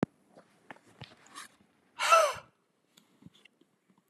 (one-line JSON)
{"exhalation_length": "4.1 s", "exhalation_amplitude": 11020, "exhalation_signal_mean_std_ratio": 0.25, "survey_phase": "beta (2021-08-13 to 2022-03-07)", "age": "18-44", "gender": "Male", "wearing_mask": "No", "symptom_none": true, "smoker_status": "Never smoked", "respiratory_condition_asthma": false, "respiratory_condition_other": false, "recruitment_source": "REACT", "submission_delay": "1 day", "covid_test_result": "Negative", "covid_test_method": "RT-qPCR", "influenza_a_test_result": "Negative", "influenza_b_test_result": "Negative"}